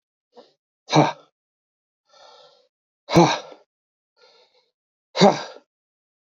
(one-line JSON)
{"exhalation_length": "6.4 s", "exhalation_amplitude": 27231, "exhalation_signal_mean_std_ratio": 0.24, "survey_phase": "beta (2021-08-13 to 2022-03-07)", "age": "45-64", "gender": "Male", "wearing_mask": "No", "symptom_runny_or_blocked_nose": true, "symptom_shortness_of_breath": true, "symptom_abdominal_pain": true, "symptom_headache": true, "symptom_onset": "12 days", "smoker_status": "Ex-smoker", "respiratory_condition_asthma": false, "respiratory_condition_other": false, "recruitment_source": "REACT", "submission_delay": "3 days", "covid_test_result": "Negative", "covid_test_method": "RT-qPCR", "influenza_a_test_result": "Negative", "influenza_b_test_result": "Negative"}